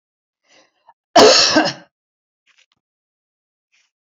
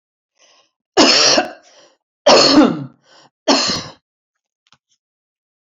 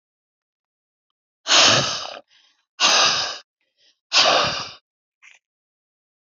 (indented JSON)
{
  "cough_length": "4.1 s",
  "cough_amplitude": 32402,
  "cough_signal_mean_std_ratio": 0.29,
  "three_cough_length": "5.6 s",
  "three_cough_amplitude": 32767,
  "three_cough_signal_mean_std_ratio": 0.4,
  "exhalation_length": "6.2 s",
  "exhalation_amplitude": 26138,
  "exhalation_signal_mean_std_ratio": 0.4,
  "survey_phase": "beta (2021-08-13 to 2022-03-07)",
  "age": "65+",
  "gender": "Female",
  "wearing_mask": "No",
  "symptom_none": true,
  "smoker_status": "Never smoked",
  "respiratory_condition_asthma": false,
  "respiratory_condition_other": false,
  "recruitment_source": "REACT",
  "submission_delay": "1 day",
  "covid_test_result": "Negative",
  "covid_test_method": "RT-qPCR",
  "influenza_a_test_result": "Negative",
  "influenza_b_test_result": "Negative"
}